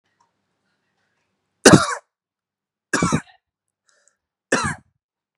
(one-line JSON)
{"three_cough_length": "5.4 s", "three_cough_amplitude": 32768, "three_cough_signal_mean_std_ratio": 0.23, "survey_phase": "beta (2021-08-13 to 2022-03-07)", "age": "18-44", "gender": "Male", "wearing_mask": "No", "symptom_none": true, "symptom_onset": "9 days", "smoker_status": "Never smoked", "respiratory_condition_asthma": false, "respiratory_condition_other": false, "recruitment_source": "REACT", "submission_delay": "1 day", "covid_test_result": "Negative", "covid_test_method": "RT-qPCR", "influenza_a_test_result": "Negative", "influenza_b_test_result": "Negative"}